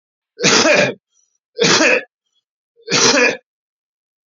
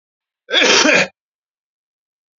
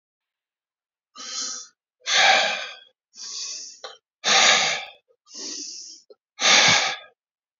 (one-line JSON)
{"three_cough_length": "4.3 s", "three_cough_amplitude": 32768, "three_cough_signal_mean_std_ratio": 0.49, "cough_length": "2.4 s", "cough_amplitude": 32650, "cough_signal_mean_std_ratio": 0.4, "exhalation_length": "7.6 s", "exhalation_amplitude": 23216, "exhalation_signal_mean_std_ratio": 0.44, "survey_phase": "beta (2021-08-13 to 2022-03-07)", "age": "45-64", "gender": "Male", "wearing_mask": "No", "symptom_cough_any": true, "symptom_new_continuous_cough": true, "symptom_runny_or_blocked_nose": true, "symptom_sore_throat": true, "symptom_abdominal_pain": true, "symptom_fatigue": true, "symptom_fever_high_temperature": true, "symptom_headache": true, "symptom_onset": "2 days", "smoker_status": "Never smoked", "respiratory_condition_asthma": false, "respiratory_condition_other": false, "recruitment_source": "Test and Trace", "submission_delay": "1 day", "covid_test_result": "Positive", "covid_test_method": "RT-qPCR", "covid_ct_value": 17.7, "covid_ct_gene": "N gene"}